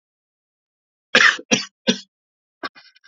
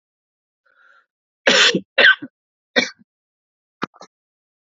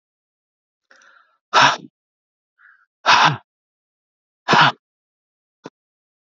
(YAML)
cough_length: 3.1 s
cough_amplitude: 32767
cough_signal_mean_std_ratio: 0.27
three_cough_length: 4.6 s
three_cough_amplitude: 30008
three_cough_signal_mean_std_ratio: 0.29
exhalation_length: 6.4 s
exhalation_amplitude: 32683
exhalation_signal_mean_std_ratio: 0.27
survey_phase: beta (2021-08-13 to 2022-03-07)
age: 45-64
gender: Male
wearing_mask: 'No'
symptom_cough_any: true
symptom_new_continuous_cough: true
symptom_runny_or_blocked_nose: true
symptom_sore_throat: true
smoker_status: Never smoked
respiratory_condition_asthma: true
respiratory_condition_other: false
recruitment_source: Test and Trace
submission_delay: 2 days
covid_test_result: Positive
covid_test_method: RT-qPCR
covid_ct_value: 17.9
covid_ct_gene: ORF1ab gene
covid_ct_mean: 18.6
covid_viral_load: 770000 copies/ml
covid_viral_load_category: Low viral load (10K-1M copies/ml)